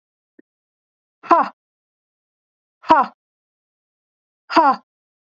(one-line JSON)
{"exhalation_length": "5.4 s", "exhalation_amplitude": 27646, "exhalation_signal_mean_std_ratio": 0.25, "survey_phase": "beta (2021-08-13 to 2022-03-07)", "age": "45-64", "gender": "Female", "wearing_mask": "No", "symptom_none": true, "symptom_onset": "12 days", "smoker_status": "Never smoked", "respiratory_condition_asthma": true, "respiratory_condition_other": false, "recruitment_source": "REACT", "submission_delay": "1 day", "covid_test_result": "Negative", "covid_test_method": "RT-qPCR", "influenza_a_test_result": "Unknown/Void", "influenza_b_test_result": "Unknown/Void"}